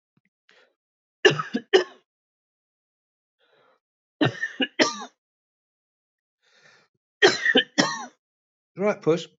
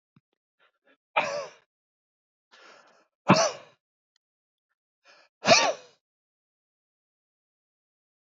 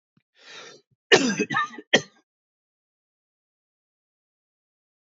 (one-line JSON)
{"three_cough_length": "9.4 s", "three_cough_amplitude": 26250, "three_cough_signal_mean_std_ratio": 0.3, "exhalation_length": "8.3 s", "exhalation_amplitude": 19849, "exhalation_signal_mean_std_ratio": 0.22, "cough_length": "5.0 s", "cough_amplitude": 25087, "cough_signal_mean_std_ratio": 0.24, "survey_phase": "beta (2021-08-13 to 2022-03-07)", "age": "45-64", "gender": "Male", "wearing_mask": "No", "symptom_none": true, "smoker_status": "Ex-smoker", "respiratory_condition_asthma": false, "respiratory_condition_other": false, "recruitment_source": "REACT", "submission_delay": "2 days", "covid_test_result": "Negative", "covid_test_method": "RT-qPCR", "influenza_a_test_result": "Negative", "influenza_b_test_result": "Negative"}